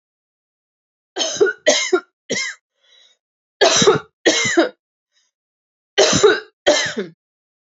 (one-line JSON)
{"three_cough_length": "7.7 s", "three_cough_amplitude": 32190, "three_cough_signal_mean_std_ratio": 0.43, "survey_phase": "alpha (2021-03-01 to 2021-08-12)", "age": "45-64", "gender": "Female", "wearing_mask": "No", "symptom_fatigue": true, "symptom_onset": "12 days", "smoker_status": "Never smoked", "respiratory_condition_asthma": false, "respiratory_condition_other": false, "recruitment_source": "REACT", "submission_delay": "0 days", "covid_test_result": "Negative", "covid_test_method": "RT-qPCR"}